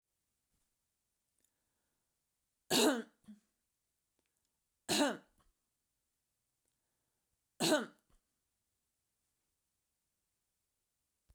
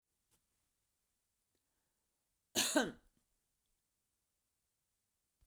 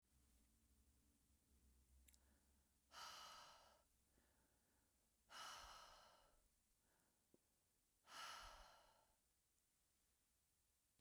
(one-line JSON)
{"three_cough_length": "11.3 s", "three_cough_amplitude": 4102, "three_cough_signal_mean_std_ratio": 0.21, "cough_length": "5.5 s", "cough_amplitude": 4111, "cough_signal_mean_std_ratio": 0.19, "exhalation_length": "11.0 s", "exhalation_amplitude": 187, "exhalation_signal_mean_std_ratio": 0.5, "survey_phase": "beta (2021-08-13 to 2022-03-07)", "age": "65+", "gender": "Female", "wearing_mask": "No", "symptom_none": true, "smoker_status": "Never smoked", "respiratory_condition_asthma": false, "respiratory_condition_other": false, "recruitment_source": "REACT", "submission_delay": "1 day", "covid_test_result": "Negative", "covid_test_method": "RT-qPCR"}